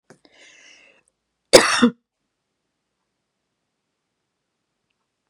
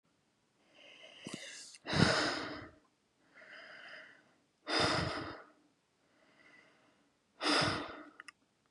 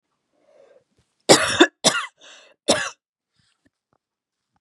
{
  "cough_length": "5.3 s",
  "cough_amplitude": 32768,
  "cough_signal_mean_std_ratio": 0.18,
  "exhalation_length": "8.7 s",
  "exhalation_amplitude": 7058,
  "exhalation_signal_mean_std_ratio": 0.4,
  "three_cough_length": "4.6 s",
  "three_cough_amplitude": 32767,
  "three_cough_signal_mean_std_ratio": 0.27,
  "survey_phase": "beta (2021-08-13 to 2022-03-07)",
  "age": "18-44",
  "gender": "Female",
  "wearing_mask": "No",
  "symptom_none": true,
  "smoker_status": "Never smoked",
  "respiratory_condition_asthma": false,
  "respiratory_condition_other": false,
  "recruitment_source": "REACT",
  "submission_delay": "1 day",
  "covid_test_result": "Negative",
  "covid_test_method": "RT-qPCR",
  "influenza_a_test_result": "Negative",
  "influenza_b_test_result": "Negative"
}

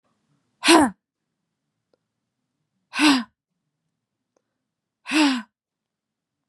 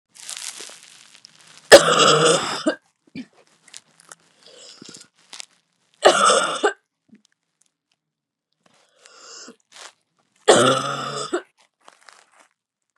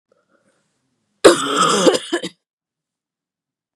{
  "exhalation_length": "6.5 s",
  "exhalation_amplitude": 30348,
  "exhalation_signal_mean_std_ratio": 0.28,
  "three_cough_length": "13.0 s",
  "three_cough_amplitude": 32768,
  "three_cough_signal_mean_std_ratio": 0.3,
  "cough_length": "3.8 s",
  "cough_amplitude": 32768,
  "cough_signal_mean_std_ratio": 0.34,
  "survey_phase": "beta (2021-08-13 to 2022-03-07)",
  "age": "18-44",
  "gender": "Female",
  "wearing_mask": "No",
  "symptom_cough_any": true,
  "symptom_new_continuous_cough": true,
  "symptom_runny_or_blocked_nose": true,
  "symptom_sore_throat": true,
  "symptom_diarrhoea": true,
  "symptom_fatigue": true,
  "symptom_headache": true,
  "symptom_change_to_sense_of_smell_or_taste": true,
  "symptom_onset": "3 days",
  "smoker_status": "Never smoked",
  "respiratory_condition_asthma": false,
  "respiratory_condition_other": false,
  "recruitment_source": "Test and Trace",
  "submission_delay": "2 days",
  "covid_test_result": "Positive",
  "covid_test_method": "RT-qPCR",
  "covid_ct_value": 26.1,
  "covid_ct_gene": "N gene"
}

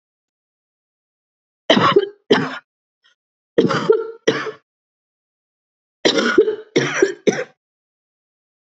{
  "three_cough_length": "8.7 s",
  "three_cough_amplitude": 30734,
  "three_cough_signal_mean_std_ratio": 0.38,
  "survey_phase": "beta (2021-08-13 to 2022-03-07)",
  "age": "18-44",
  "gender": "Female",
  "wearing_mask": "No",
  "symptom_new_continuous_cough": true,
  "symptom_shortness_of_breath": true,
  "symptom_fatigue": true,
  "symptom_headache": true,
  "symptom_change_to_sense_of_smell_or_taste": true,
  "symptom_loss_of_taste": true,
  "symptom_onset": "4 days",
  "smoker_status": "Never smoked",
  "respiratory_condition_asthma": true,
  "respiratory_condition_other": false,
  "recruitment_source": "Test and Trace",
  "submission_delay": "2 days",
  "covid_test_result": "Positive",
  "covid_test_method": "RT-qPCR",
  "covid_ct_value": 18.9,
  "covid_ct_gene": "ORF1ab gene",
  "covid_ct_mean": 19.6,
  "covid_viral_load": "380000 copies/ml",
  "covid_viral_load_category": "Low viral load (10K-1M copies/ml)"
}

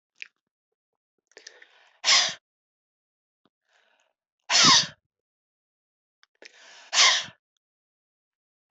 {
  "exhalation_length": "8.7 s",
  "exhalation_amplitude": 19406,
  "exhalation_signal_mean_std_ratio": 0.25,
  "survey_phase": "beta (2021-08-13 to 2022-03-07)",
  "age": "45-64",
  "gender": "Female",
  "wearing_mask": "No",
  "symptom_none": true,
  "smoker_status": "Never smoked",
  "respiratory_condition_asthma": true,
  "respiratory_condition_other": true,
  "recruitment_source": "REACT",
  "submission_delay": "1 day",
  "covid_test_result": "Negative",
  "covid_test_method": "RT-qPCR",
  "influenza_a_test_result": "Negative",
  "influenza_b_test_result": "Negative"
}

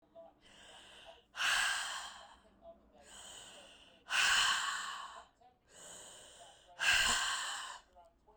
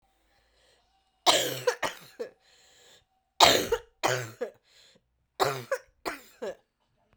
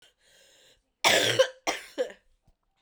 {
  "exhalation_length": "8.4 s",
  "exhalation_amplitude": 3961,
  "exhalation_signal_mean_std_ratio": 0.5,
  "three_cough_length": "7.2 s",
  "three_cough_amplitude": 32767,
  "three_cough_signal_mean_std_ratio": 0.33,
  "cough_length": "2.8 s",
  "cough_amplitude": 14837,
  "cough_signal_mean_std_ratio": 0.37,
  "survey_phase": "beta (2021-08-13 to 2022-03-07)",
  "age": "45-64",
  "gender": "Female",
  "wearing_mask": "No",
  "symptom_cough_any": true,
  "symptom_new_continuous_cough": true,
  "symptom_runny_or_blocked_nose": true,
  "symptom_fatigue": true,
  "symptom_fever_high_temperature": true,
  "symptom_headache": true,
  "symptom_change_to_sense_of_smell_or_taste": true,
  "symptom_onset": "3 days",
  "smoker_status": "Never smoked",
  "respiratory_condition_asthma": false,
  "respiratory_condition_other": false,
  "recruitment_source": "Test and Trace",
  "submission_delay": "2 days",
  "covid_test_result": "Positive",
  "covid_test_method": "RT-qPCR"
}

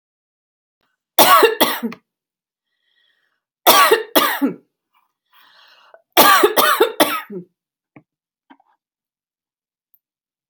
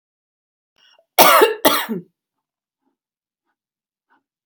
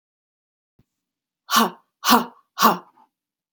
{
  "three_cough_length": "10.5 s",
  "three_cough_amplitude": 32768,
  "three_cough_signal_mean_std_ratio": 0.35,
  "cough_length": "4.5 s",
  "cough_amplitude": 32768,
  "cough_signal_mean_std_ratio": 0.28,
  "exhalation_length": "3.5 s",
  "exhalation_amplitude": 27208,
  "exhalation_signal_mean_std_ratio": 0.3,
  "survey_phase": "beta (2021-08-13 to 2022-03-07)",
  "age": "45-64",
  "gender": "Female",
  "wearing_mask": "No",
  "symptom_cough_any": true,
  "symptom_runny_or_blocked_nose": true,
  "symptom_onset": "12 days",
  "smoker_status": "Never smoked",
  "respiratory_condition_asthma": false,
  "respiratory_condition_other": false,
  "recruitment_source": "REACT",
  "submission_delay": "2 days",
  "covid_test_result": "Negative",
  "covid_test_method": "RT-qPCR"
}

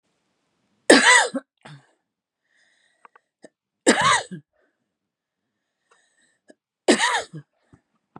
{
  "three_cough_length": "8.2 s",
  "three_cough_amplitude": 32749,
  "three_cough_signal_mean_std_ratio": 0.28,
  "survey_phase": "beta (2021-08-13 to 2022-03-07)",
  "age": "45-64",
  "gender": "Female",
  "wearing_mask": "No",
  "symptom_shortness_of_breath": true,
  "symptom_fatigue": true,
  "symptom_onset": "12 days",
  "smoker_status": "Never smoked",
  "respiratory_condition_asthma": true,
  "respiratory_condition_other": false,
  "recruitment_source": "REACT",
  "submission_delay": "2 days",
  "covid_test_result": "Negative",
  "covid_test_method": "RT-qPCR",
  "influenza_a_test_result": "Negative",
  "influenza_b_test_result": "Negative"
}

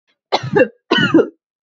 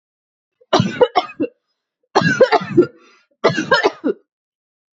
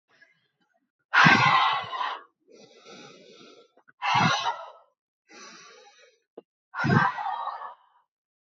{
  "cough_length": "1.6 s",
  "cough_amplitude": 27755,
  "cough_signal_mean_std_ratio": 0.49,
  "three_cough_length": "4.9 s",
  "three_cough_amplitude": 30212,
  "three_cough_signal_mean_std_ratio": 0.42,
  "exhalation_length": "8.4 s",
  "exhalation_amplitude": 19754,
  "exhalation_signal_mean_std_ratio": 0.4,
  "survey_phase": "beta (2021-08-13 to 2022-03-07)",
  "age": "18-44",
  "gender": "Female",
  "wearing_mask": "No",
  "symptom_none": true,
  "smoker_status": "Ex-smoker",
  "respiratory_condition_asthma": false,
  "respiratory_condition_other": false,
  "recruitment_source": "REACT",
  "submission_delay": "4 days",
  "covid_test_result": "Negative",
  "covid_test_method": "RT-qPCR",
  "influenza_a_test_result": "Negative",
  "influenza_b_test_result": "Negative"
}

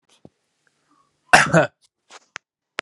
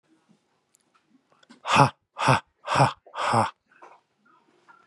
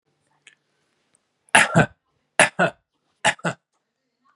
{
  "cough_length": "2.8 s",
  "cough_amplitude": 32768,
  "cough_signal_mean_std_ratio": 0.24,
  "exhalation_length": "4.9 s",
  "exhalation_amplitude": 24335,
  "exhalation_signal_mean_std_ratio": 0.34,
  "three_cough_length": "4.4 s",
  "three_cough_amplitude": 32762,
  "three_cough_signal_mean_std_ratio": 0.27,
  "survey_phase": "beta (2021-08-13 to 2022-03-07)",
  "age": "18-44",
  "gender": "Male",
  "wearing_mask": "No",
  "symptom_runny_or_blocked_nose": true,
  "symptom_sore_throat": true,
  "symptom_fatigue": true,
  "symptom_headache": true,
  "smoker_status": "Never smoked",
  "respiratory_condition_asthma": false,
  "respiratory_condition_other": false,
  "recruitment_source": "Test and Trace",
  "submission_delay": "1 day",
  "covid_test_result": "Positive",
  "covid_test_method": "ePCR"
}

